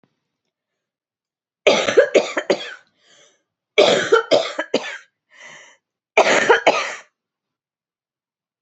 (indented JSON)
{
  "three_cough_length": "8.6 s",
  "three_cough_amplitude": 29433,
  "three_cough_signal_mean_std_ratio": 0.38,
  "survey_phase": "beta (2021-08-13 to 2022-03-07)",
  "age": "45-64",
  "gender": "Female",
  "wearing_mask": "No",
  "symptom_cough_any": true,
  "symptom_diarrhoea": true,
  "symptom_fatigue": true,
  "symptom_fever_high_temperature": true,
  "symptom_headache": true,
  "symptom_onset": "4 days",
  "smoker_status": "Never smoked",
  "respiratory_condition_asthma": false,
  "respiratory_condition_other": false,
  "recruitment_source": "Test and Trace",
  "submission_delay": "1 day",
  "covid_test_result": "Positive",
  "covid_test_method": "RT-qPCR",
  "covid_ct_value": 16.4,
  "covid_ct_gene": "ORF1ab gene"
}